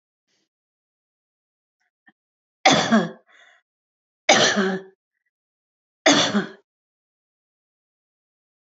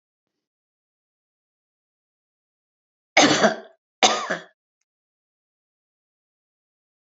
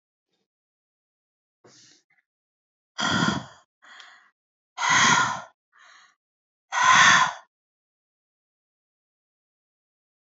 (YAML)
three_cough_length: 8.6 s
three_cough_amplitude: 28744
three_cough_signal_mean_std_ratio: 0.29
cough_length: 7.2 s
cough_amplitude: 29390
cough_signal_mean_std_ratio: 0.22
exhalation_length: 10.2 s
exhalation_amplitude: 23976
exhalation_signal_mean_std_ratio: 0.31
survey_phase: alpha (2021-03-01 to 2021-08-12)
age: 65+
gender: Female
wearing_mask: 'No'
symptom_none: true
smoker_status: Ex-smoker
respiratory_condition_asthma: false
respiratory_condition_other: false
recruitment_source: REACT
submission_delay: 2 days
covid_test_result: Negative
covid_test_method: RT-qPCR